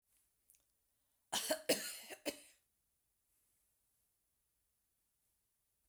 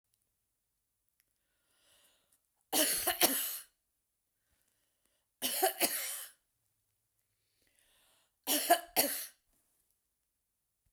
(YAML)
cough_length: 5.9 s
cough_amplitude: 3487
cough_signal_mean_std_ratio: 0.25
three_cough_length: 10.9 s
three_cough_amplitude: 8736
three_cough_signal_mean_std_ratio: 0.32
survey_phase: beta (2021-08-13 to 2022-03-07)
age: 65+
gender: Female
wearing_mask: 'No'
symptom_none: true
symptom_onset: 12 days
smoker_status: Never smoked
respiratory_condition_asthma: false
respiratory_condition_other: false
recruitment_source: REACT
submission_delay: 1 day
covid_test_result: Negative
covid_test_method: RT-qPCR